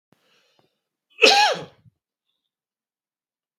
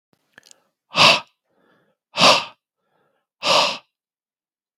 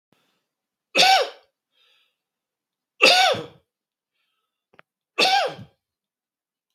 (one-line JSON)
{"cough_length": "3.6 s", "cough_amplitude": 32768, "cough_signal_mean_std_ratio": 0.25, "exhalation_length": "4.8 s", "exhalation_amplitude": 32768, "exhalation_signal_mean_std_ratio": 0.31, "three_cough_length": "6.7 s", "three_cough_amplitude": 32768, "three_cough_signal_mean_std_ratio": 0.31, "survey_phase": "beta (2021-08-13 to 2022-03-07)", "age": "45-64", "gender": "Male", "wearing_mask": "No", "symptom_none": true, "smoker_status": "Ex-smoker", "respiratory_condition_asthma": false, "respiratory_condition_other": false, "recruitment_source": "REACT", "submission_delay": "7 days", "covid_test_result": "Negative", "covid_test_method": "RT-qPCR", "influenza_a_test_result": "Negative", "influenza_b_test_result": "Negative"}